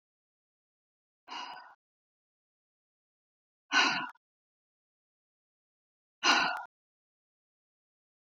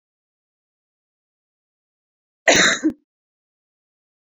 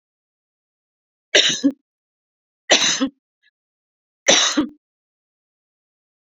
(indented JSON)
{
  "exhalation_length": "8.3 s",
  "exhalation_amplitude": 9215,
  "exhalation_signal_mean_std_ratio": 0.24,
  "cough_length": "4.4 s",
  "cough_amplitude": 28398,
  "cough_signal_mean_std_ratio": 0.23,
  "three_cough_length": "6.3 s",
  "three_cough_amplitude": 32767,
  "three_cough_signal_mean_std_ratio": 0.31,
  "survey_phase": "beta (2021-08-13 to 2022-03-07)",
  "age": "45-64",
  "gender": "Female",
  "wearing_mask": "No",
  "symptom_none": true,
  "smoker_status": "Never smoked",
  "respiratory_condition_asthma": false,
  "respiratory_condition_other": false,
  "recruitment_source": "REACT",
  "submission_delay": "1 day",
  "covid_test_result": "Negative",
  "covid_test_method": "RT-qPCR"
}